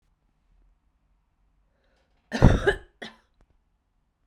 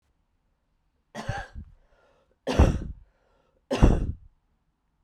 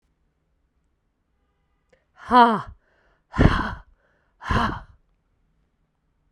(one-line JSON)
{"cough_length": "4.3 s", "cough_amplitude": 32767, "cough_signal_mean_std_ratio": 0.2, "three_cough_length": "5.0 s", "three_cough_amplitude": 20409, "three_cough_signal_mean_std_ratio": 0.3, "exhalation_length": "6.3 s", "exhalation_amplitude": 30060, "exhalation_signal_mean_std_ratio": 0.28, "survey_phase": "beta (2021-08-13 to 2022-03-07)", "age": "18-44", "gender": "Female", "wearing_mask": "No", "symptom_cough_any": true, "symptom_runny_or_blocked_nose": true, "symptom_shortness_of_breath": true, "symptom_diarrhoea": true, "symptom_fatigue": true, "symptom_headache": true, "symptom_change_to_sense_of_smell_or_taste": true, "symptom_other": true, "symptom_onset": "3 days", "smoker_status": "Ex-smoker", "respiratory_condition_asthma": true, "respiratory_condition_other": false, "recruitment_source": "Test and Trace", "submission_delay": "1 day", "covid_test_result": "Positive", "covid_test_method": "RT-qPCR", "covid_ct_value": 27.2, "covid_ct_gene": "N gene"}